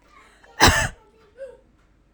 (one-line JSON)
{"cough_length": "2.1 s", "cough_amplitude": 32767, "cough_signal_mean_std_ratio": 0.3, "survey_phase": "alpha (2021-03-01 to 2021-08-12)", "age": "18-44", "gender": "Female", "wearing_mask": "No", "symptom_none": true, "smoker_status": "Never smoked", "respiratory_condition_asthma": false, "respiratory_condition_other": false, "recruitment_source": "REACT", "submission_delay": "5 days", "covid_test_result": "Negative", "covid_test_method": "RT-qPCR"}